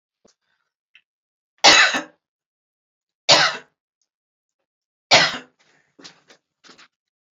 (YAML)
cough_length: 7.3 s
cough_amplitude: 31621
cough_signal_mean_std_ratio: 0.25
survey_phase: beta (2021-08-13 to 2022-03-07)
age: 45-64
gender: Female
wearing_mask: 'No'
symptom_none: true
smoker_status: Never smoked
respiratory_condition_asthma: false
respiratory_condition_other: false
recruitment_source: REACT
submission_delay: 0 days
covid_test_result: Negative
covid_test_method: RT-qPCR